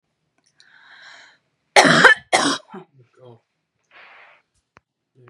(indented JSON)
{
  "cough_length": "5.3 s",
  "cough_amplitude": 32768,
  "cough_signal_mean_std_ratio": 0.27,
  "survey_phase": "beta (2021-08-13 to 2022-03-07)",
  "age": "18-44",
  "gender": "Female",
  "wearing_mask": "No",
  "symptom_none": true,
  "smoker_status": "Never smoked",
  "respiratory_condition_asthma": false,
  "respiratory_condition_other": false,
  "recruitment_source": "REACT",
  "submission_delay": "1 day",
  "covid_test_result": "Negative",
  "covid_test_method": "RT-qPCR",
  "influenza_a_test_result": "Negative",
  "influenza_b_test_result": "Negative"
}